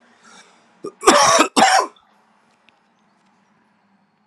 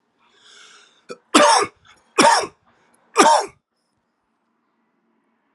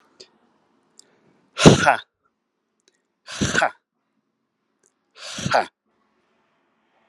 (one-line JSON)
{"cough_length": "4.3 s", "cough_amplitude": 32768, "cough_signal_mean_std_ratio": 0.34, "three_cough_length": "5.5 s", "three_cough_amplitude": 32768, "three_cough_signal_mean_std_ratio": 0.33, "exhalation_length": "7.1 s", "exhalation_amplitude": 32768, "exhalation_signal_mean_std_ratio": 0.24, "survey_phase": "alpha (2021-03-01 to 2021-08-12)", "age": "45-64", "gender": "Male", "wearing_mask": "No", "symptom_cough_any": true, "symptom_fatigue": true, "symptom_headache": true, "symptom_change_to_sense_of_smell_or_taste": true, "smoker_status": "Never smoked", "respiratory_condition_asthma": false, "respiratory_condition_other": false, "recruitment_source": "Test and Trace", "submission_delay": "3 days", "covid_test_result": "Positive", "covid_test_method": "RT-qPCR", "covid_ct_value": 21.0, "covid_ct_gene": "ORF1ab gene"}